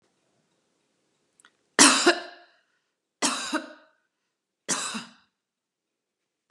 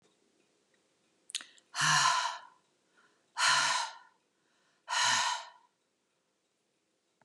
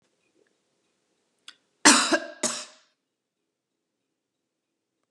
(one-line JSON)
{"three_cough_length": "6.5 s", "three_cough_amplitude": 29199, "three_cough_signal_mean_std_ratio": 0.26, "exhalation_length": "7.2 s", "exhalation_amplitude": 6803, "exhalation_signal_mean_std_ratio": 0.4, "cough_length": "5.1 s", "cough_amplitude": 31665, "cough_signal_mean_std_ratio": 0.21, "survey_phase": "beta (2021-08-13 to 2022-03-07)", "age": "45-64", "gender": "Female", "wearing_mask": "No", "symptom_cough_any": true, "smoker_status": "Never smoked", "respiratory_condition_asthma": false, "respiratory_condition_other": false, "recruitment_source": "REACT", "submission_delay": "2 days", "covid_test_result": "Negative", "covid_test_method": "RT-qPCR", "influenza_a_test_result": "Negative", "influenza_b_test_result": "Negative"}